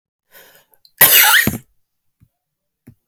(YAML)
cough_length: 3.1 s
cough_amplitude: 32768
cough_signal_mean_std_ratio: 0.33
survey_phase: beta (2021-08-13 to 2022-03-07)
age: 45-64
gender: Female
wearing_mask: 'No'
symptom_new_continuous_cough: true
symptom_runny_or_blocked_nose: true
symptom_shortness_of_breath: true
symptom_sore_throat: true
symptom_fatigue: true
symptom_fever_high_temperature: true
symptom_headache: true
symptom_other: true
symptom_onset: 6 days
smoker_status: Ex-smoker
respiratory_condition_asthma: true
respiratory_condition_other: false
recruitment_source: Test and Trace
submission_delay: 5 days
covid_test_result: Positive
covid_test_method: ePCR